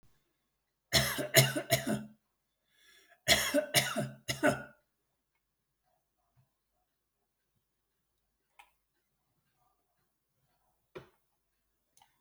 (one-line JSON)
{"cough_length": "12.2 s", "cough_amplitude": 14470, "cough_signal_mean_std_ratio": 0.28, "survey_phase": "alpha (2021-03-01 to 2021-08-12)", "age": "65+", "gender": "Male", "wearing_mask": "No", "symptom_none": true, "smoker_status": "Never smoked", "respiratory_condition_asthma": false, "respiratory_condition_other": false, "recruitment_source": "REACT", "submission_delay": "6 days", "covid_test_result": "Negative", "covid_test_method": "RT-qPCR"}